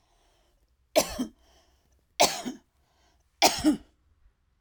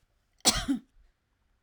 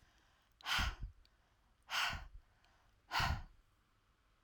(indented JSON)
{
  "three_cough_length": "4.6 s",
  "three_cough_amplitude": 18217,
  "three_cough_signal_mean_std_ratio": 0.3,
  "cough_length": "1.6 s",
  "cough_amplitude": 13473,
  "cough_signal_mean_std_ratio": 0.31,
  "exhalation_length": "4.4 s",
  "exhalation_amplitude": 2102,
  "exhalation_signal_mean_std_ratio": 0.41,
  "survey_phase": "alpha (2021-03-01 to 2021-08-12)",
  "age": "45-64",
  "gender": "Female",
  "wearing_mask": "No",
  "symptom_none": true,
  "smoker_status": "Never smoked",
  "respiratory_condition_asthma": false,
  "respiratory_condition_other": false,
  "recruitment_source": "REACT",
  "submission_delay": "2 days",
  "covid_test_result": "Negative",
  "covid_test_method": "RT-qPCR"
}